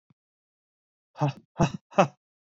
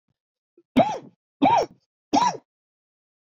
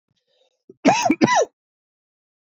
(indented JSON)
{
  "exhalation_length": "2.6 s",
  "exhalation_amplitude": 19991,
  "exhalation_signal_mean_std_ratio": 0.26,
  "three_cough_length": "3.2 s",
  "three_cough_amplitude": 16880,
  "three_cough_signal_mean_std_ratio": 0.37,
  "cough_length": "2.6 s",
  "cough_amplitude": 32767,
  "cough_signal_mean_std_ratio": 0.36,
  "survey_phase": "alpha (2021-03-01 to 2021-08-12)",
  "age": "18-44",
  "gender": "Male",
  "wearing_mask": "No",
  "symptom_cough_any": true,
  "symptom_shortness_of_breath": true,
  "symptom_fatigue": true,
  "symptom_headache": true,
  "symptom_onset": "3 days",
  "smoker_status": "Ex-smoker",
  "respiratory_condition_asthma": false,
  "respiratory_condition_other": false,
  "recruitment_source": "Test and Trace",
  "submission_delay": "2 days",
  "covid_test_result": "Positive",
  "covid_test_method": "RT-qPCR"
}